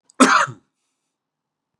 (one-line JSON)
{"cough_length": "1.8 s", "cough_amplitude": 32675, "cough_signal_mean_std_ratio": 0.3, "survey_phase": "beta (2021-08-13 to 2022-03-07)", "age": "45-64", "gender": "Male", "wearing_mask": "No", "symptom_none": true, "smoker_status": "Never smoked", "respiratory_condition_asthma": false, "respiratory_condition_other": false, "recruitment_source": "REACT", "submission_delay": "3 days", "covid_test_result": "Negative", "covid_test_method": "RT-qPCR", "influenza_a_test_result": "Negative", "influenza_b_test_result": "Negative"}